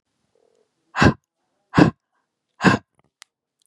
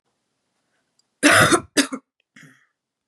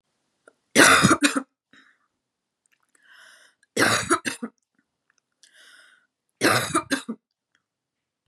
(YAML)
exhalation_length: 3.7 s
exhalation_amplitude: 32767
exhalation_signal_mean_std_ratio: 0.26
cough_length: 3.1 s
cough_amplitude: 30842
cough_signal_mean_std_ratio: 0.31
three_cough_length: 8.3 s
three_cough_amplitude: 30138
three_cough_signal_mean_std_ratio: 0.32
survey_phase: beta (2021-08-13 to 2022-03-07)
age: 18-44
gender: Female
wearing_mask: 'No'
symptom_cough_any: true
symptom_runny_or_blocked_nose: true
symptom_sore_throat: true
symptom_headache: true
smoker_status: Prefer not to say
respiratory_condition_asthma: false
respiratory_condition_other: false
recruitment_source: Test and Trace
submission_delay: 2 days
covid_test_result: Positive
covid_test_method: RT-qPCR
covid_ct_value: 22.8
covid_ct_gene: ORF1ab gene
covid_ct_mean: 23.1
covid_viral_load: 27000 copies/ml
covid_viral_load_category: Low viral load (10K-1M copies/ml)